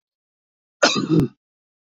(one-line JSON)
{"cough_length": "2.0 s", "cough_amplitude": 26274, "cough_signal_mean_std_ratio": 0.35, "survey_phase": "beta (2021-08-13 to 2022-03-07)", "age": "45-64", "gender": "Male", "wearing_mask": "No", "symptom_runny_or_blocked_nose": true, "symptom_shortness_of_breath": true, "symptom_abdominal_pain": true, "symptom_headache": true, "symptom_onset": "12 days", "smoker_status": "Ex-smoker", "respiratory_condition_asthma": false, "respiratory_condition_other": false, "recruitment_source": "REACT", "submission_delay": "3 days", "covid_test_result": "Negative", "covid_test_method": "RT-qPCR", "influenza_a_test_result": "Negative", "influenza_b_test_result": "Negative"}